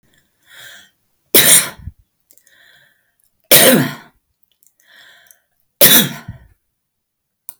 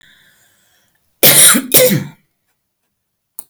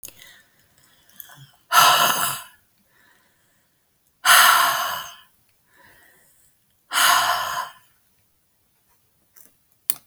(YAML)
three_cough_length: 7.6 s
three_cough_amplitude: 32768
three_cough_signal_mean_std_ratio: 0.3
cough_length: 3.5 s
cough_amplitude: 32768
cough_signal_mean_std_ratio: 0.38
exhalation_length: 10.1 s
exhalation_amplitude: 32768
exhalation_signal_mean_std_ratio: 0.36
survey_phase: beta (2021-08-13 to 2022-03-07)
age: 65+
gender: Female
wearing_mask: 'No'
symptom_none: true
smoker_status: Ex-smoker
respiratory_condition_asthma: false
respiratory_condition_other: false
recruitment_source: REACT
submission_delay: 2 days
covid_test_result: Negative
covid_test_method: RT-qPCR